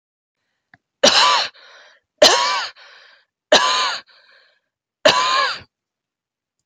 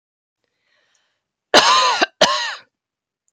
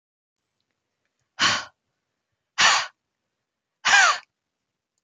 three_cough_length: 6.7 s
three_cough_amplitude: 31551
three_cough_signal_mean_std_ratio: 0.41
cough_length: 3.3 s
cough_amplitude: 32768
cough_signal_mean_std_ratio: 0.38
exhalation_length: 5.0 s
exhalation_amplitude: 19819
exhalation_signal_mean_std_ratio: 0.31
survey_phase: alpha (2021-03-01 to 2021-08-12)
age: 45-64
gender: Female
wearing_mask: 'No'
symptom_none: true
smoker_status: Never smoked
respiratory_condition_asthma: false
respiratory_condition_other: false
recruitment_source: REACT
submission_delay: 1 day
covid_test_result: Negative
covid_test_method: RT-qPCR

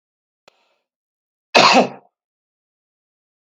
cough_length: 3.4 s
cough_amplitude: 32768
cough_signal_mean_std_ratio: 0.24
survey_phase: beta (2021-08-13 to 2022-03-07)
age: 45-64
gender: Male
wearing_mask: 'No'
symptom_none: true
smoker_status: Never smoked
respiratory_condition_asthma: false
respiratory_condition_other: false
recruitment_source: REACT
submission_delay: 2 days
covid_test_result: Negative
covid_test_method: RT-qPCR
influenza_a_test_result: Negative
influenza_b_test_result: Negative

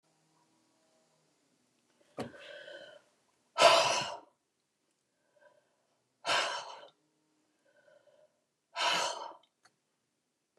exhalation_length: 10.6 s
exhalation_amplitude: 13215
exhalation_signal_mean_std_ratio: 0.27
survey_phase: beta (2021-08-13 to 2022-03-07)
age: 65+
gender: Female
wearing_mask: 'No'
symptom_none: true
smoker_status: Never smoked
respiratory_condition_asthma: false
respiratory_condition_other: false
recruitment_source: REACT
submission_delay: 0 days
covid_test_result: Negative
covid_test_method: RT-qPCR
influenza_a_test_result: Negative
influenza_b_test_result: Negative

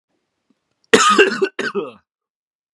cough_length: 2.7 s
cough_amplitude: 32768
cough_signal_mean_std_ratio: 0.38
survey_phase: beta (2021-08-13 to 2022-03-07)
age: 18-44
gender: Male
wearing_mask: 'No'
symptom_cough_any: true
symptom_runny_or_blocked_nose: true
symptom_headache: true
symptom_onset: 3 days
smoker_status: Never smoked
respiratory_condition_asthma: false
respiratory_condition_other: false
recruitment_source: Test and Trace
submission_delay: 2 days
covid_test_result: Positive
covid_test_method: RT-qPCR
covid_ct_value: 23.1
covid_ct_gene: N gene
covid_ct_mean: 23.7
covid_viral_load: 17000 copies/ml
covid_viral_load_category: Low viral load (10K-1M copies/ml)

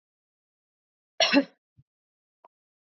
cough_length: 2.8 s
cough_amplitude: 12630
cough_signal_mean_std_ratio: 0.21
survey_phase: beta (2021-08-13 to 2022-03-07)
age: 18-44
gender: Female
wearing_mask: 'No'
symptom_runny_or_blocked_nose: true
symptom_sore_throat: true
symptom_fatigue: true
symptom_headache: true
symptom_change_to_sense_of_smell_or_taste: true
symptom_loss_of_taste: true
smoker_status: Never smoked
respiratory_condition_asthma: false
respiratory_condition_other: false
recruitment_source: Test and Trace
submission_delay: 2 days
covid_test_result: Positive
covid_test_method: RT-qPCR
covid_ct_value: 15.4
covid_ct_gene: ORF1ab gene
covid_ct_mean: 15.6
covid_viral_load: 7900000 copies/ml
covid_viral_load_category: High viral load (>1M copies/ml)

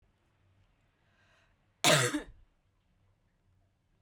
cough_length: 4.0 s
cough_amplitude: 11677
cough_signal_mean_std_ratio: 0.24
survey_phase: beta (2021-08-13 to 2022-03-07)
age: 18-44
gender: Female
wearing_mask: 'No'
symptom_cough_any: true
symptom_runny_or_blocked_nose: true
symptom_shortness_of_breath: true
symptom_sore_throat: true
symptom_abdominal_pain: true
symptom_diarrhoea: true
symptom_fatigue: true
symptom_fever_high_temperature: true
symptom_change_to_sense_of_smell_or_taste: true
symptom_loss_of_taste: true
smoker_status: Current smoker (e-cigarettes or vapes only)
respiratory_condition_asthma: false
respiratory_condition_other: false
recruitment_source: Test and Trace
submission_delay: 1 day
covid_test_result: Positive
covid_test_method: LFT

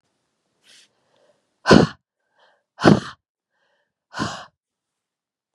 exhalation_length: 5.5 s
exhalation_amplitude: 32768
exhalation_signal_mean_std_ratio: 0.21
survey_phase: beta (2021-08-13 to 2022-03-07)
age: 18-44
gender: Female
wearing_mask: 'No'
symptom_cough_any: true
symptom_shortness_of_breath: true
symptom_sore_throat: true
symptom_fatigue: true
symptom_headache: true
symptom_other: true
smoker_status: Never smoked
respiratory_condition_asthma: false
respiratory_condition_other: false
recruitment_source: Test and Trace
submission_delay: 1 day
covid_test_result: Positive
covid_test_method: LFT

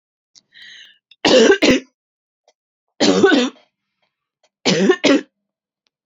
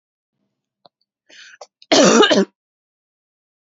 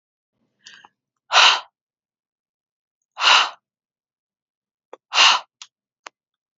three_cough_length: 6.1 s
three_cough_amplitude: 32767
three_cough_signal_mean_std_ratio: 0.41
cough_length: 3.8 s
cough_amplitude: 29470
cough_signal_mean_std_ratio: 0.31
exhalation_length: 6.6 s
exhalation_amplitude: 32325
exhalation_signal_mean_std_ratio: 0.27
survey_phase: beta (2021-08-13 to 2022-03-07)
age: 18-44
gender: Female
wearing_mask: 'No'
symptom_none: true
smoker_status: Never smoked
respiratory_condition_asthma: false
respiratory_condition_other: false
recruitment_source: REACT
submission_delay: 2 days
covid_test_result: Negative
covid_test_method: RT-qPCR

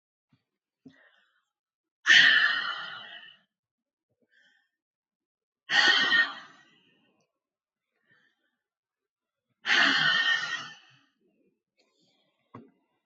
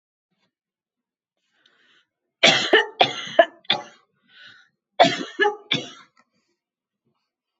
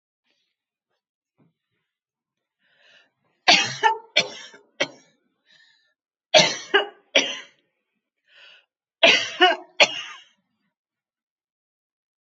exhalation_length: 13.1 s
exhalation_amplitude: 16384
exhalation_signal_mean_std_ratio: 0.33
cough_length: 7.6 s
cough_amplitude: 29708
cough_signal_mean_std_ratio: 0.28
three_cough_length: 12.2 s
three_cough_amplitude: 30099
three_cough_signal_mean_std_ratio: 0.26
survey_phase: alpha (2021-03-01 to 2021-08-12)
age: 65+
gender: Female
wearing_mask: 'No'
symptom_none: true
smoker_status: Never smoked
respiratory_condition_asthma: false
respiratory_condition_other: false
recruitment_source: REACT
submission_delay: 1 day
covid_test_result: Negative
covid_test_method: RT-qPCR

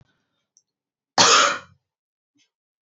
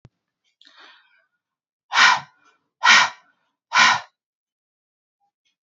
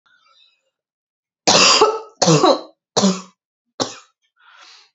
cough_length: 2.8 s
cough_amplitude: 29193
cough_signal_mean_std_ratio: 0.29
exhalation_length: 5.6 s
exhalation_amplitude: 28916
exhalation_signal_mean_std_ratio: 0.29
three_cough_length: 4.9 s
three_cough_amplitude: 30088
three_cough_signal_mean_std_ratio: 0.39
survey_phase: beta (2021-08-13 to 2022-03-07)
age: 18-44
gender: Female
wearing_mask: 'No'
symptom_cough_any: true
symptom_sore_throat: true
symptom_other: true
symptom_onset: 1 day
smoker_status: Never smoked
respiratory_condition_asthma: false
respiratory_condition_other: false
recruitment_source: Test and Trace
submission_delay: 1 day
covid_test_result: Positive
covid_test_method: RT-qPCR
covid_ct_value: 30.9
covid_ct_gene: ORF1ab gene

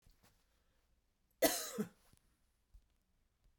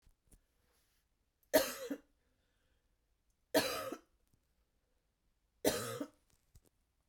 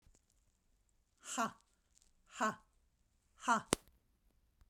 cough_length: 3.6 s
cough_amplitude: 4341
cough_signal_mean_std_ratio: 0.24
three_cough_length: 7.1 s
three_cough_amplitude: 5668
three_cough_signal_mean_std_ratio: 0.27
exhalation_length: 4.7 s
exhalation_amplitude: 15721
exhalation_signal_mean_std_ratio: 0.26
survey_phase: beta (2021-08-13 to 2022-03-07)
age: 45-64
gender: Female
wearing_mask: 'No'
symptom_none: true
smoker_status: Ex-smoker
respiratory_condition_asthma: false
respiratory_condition_other: false
recruitment_source: REACT
submission_delay: 2 days
covid_test_method: RT-qPCR
influenza_a_test_result: Unknown/Void
influenza_b_test_result: Unknown/Void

